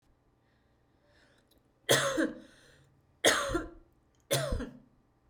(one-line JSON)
{"three_cough_length": "5.3 s", "three_cough_amplitude": 10309, "three_cough_signal_mean_std_ratio": 0.37, "survey_phase": "beta (2021-08-13 to 2022-03-07)", "age": "18-44", "gender": "Female", "wearing_mask": "Yes", "symptom_fatigue": true, "symptom_onset": "12 days", "smoker_status": "Ex-smoker", "respiratory_condition_asthma": true, "respiratory_condition_other": false, "recruitment_source": "REACT", "submission_delay": "3 days", "covid_test_result": "Negative", "covid_test_method": "RT-qPCR"}